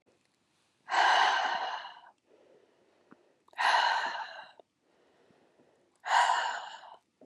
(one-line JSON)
{"exhalation_length": "7.3 s", "exhalation_amplitude": 7264, "exhalation_signal_mean_std_ratio": 0.45, "survey_phase": "beta (2021-08-13 to 2022-03-07)", "age": "18-44", "gender": "Female", "wearing_mask": "No", "symptom_new_continuous_cough": true, "symptom_runny_or_blocked_nose": true, "symptom_fatigue": true, "symptom_fever_high_temperature": true, "symptom_headache": true, "symptom_change_to_sense_of_smell_or_taste": true, "symptom_other": true, "symptom_onset": "2 days", "smoker_status": "Never smoked", "respiratory_condition_asthma": false, "respiratory_condition_other": false, "recruitment_source": "Test and Trace", "submission_delay": "1 day", "covid_test_result": "Positive", "covid_test_method": "RT-qPCR", "covid_ct_value": 18.3, "covid_ct_gene": "N gene"}